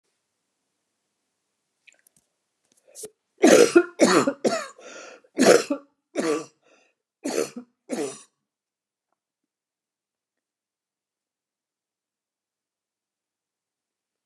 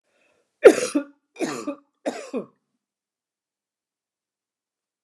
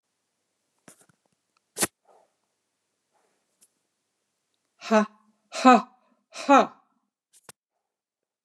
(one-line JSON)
{"cough_length": "14.3 s", "cough_amplitude": 28813, "cough_signal_mean_std_ratio": 0.25, "three_cough_length": "5.0 s", "three_cough_amplitude": 29204, "three_cough_signal_mean_std_ratio": 0.2, "exhalation_length": "8.4 s", "exhalation_amplitude": 23824, "exhalation_signal_mean_std_ratio": 0.21, "survey_phase": "beta (2021-08-13 to 2022-03-07)", "age": "65+", "gender": "Female", "wearing_mask": "No", "symptom_none": true, "smoker_status": "Never smoked", "respiratory_condition_asthma": false, "respiratory_condition_other": false, "recruitment_source": "REACT", "submission_delay": "9 days", "covid_test_result": "Negative", "covid_test_method": "RT-qPCR", "influenza_a_test_result": "Negative", "influenza_b_test_result": "Negative"}